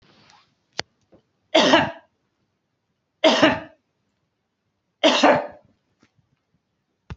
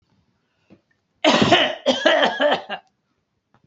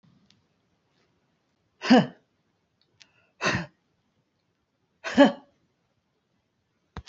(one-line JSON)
{"three_cough_length": "7.2 s", "three_cough_amplitude": 26251, "three_cough_signal_mean_std_ratio": 0.31, "cough_length": "3.7 s", "cough_amplitude": 26762, "cough_signal_mean_std_ratio": 0.47, "exhalation_length": "7.1 s", "exhalation_amplitude": 22010, "exhalation_signal_mean_std_ratio": 0.21, "survey_phase": "beta (2021-08-13 to 2022-03-07)", "age": "45-64", "gender": "Female", "wearing_mask": "No", "symptom_runny_or_blocked_nose": true, "symptom_onset": "8 days", "smoker_status": "Never smoked", "respiratory_condition_asthma": false, "respiratory_condition_other": false, "recruitment_source": "REACT", "submission_delay": "2 days", "covid_test_result": "Negative", "covid_test_method": "RT-qPCR", "influenza_a_test_result": "Negative", "influenza_b_test_result": "Negative"}